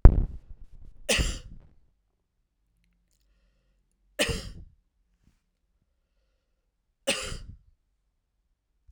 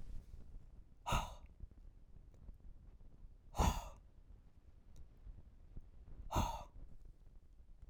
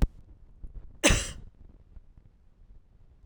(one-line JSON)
{"three_cough_length": "8.9 s", "three_cough_amplitude": 32768, "three_cough_signal_mean_std_ratio": 0.18, "exhalation_length": "7.9 s", "exhalation_amplitude": 2790, "exhalation_signal_mean_std_ratio": 0.48, "cough_length": "3.3 s", "cough_amplitude": 18733, "cough_signal_mean_std_ratio": 0.31, "survey_phase": "beta (2021-08-13 to 2022-03-07)", "age": "45-64", "gender": "Male", "wearing_mask": "No", "symptom_none": true, "smoker_status": "Ex-smoker", "respiratory_condition_asthma": false, "respiratory_condition_other": false, "recruitment_source": "REACT", "submission_delay": "1 day", "covid_test_result": "Negative", "covid_test_method": "RT-qPCR"}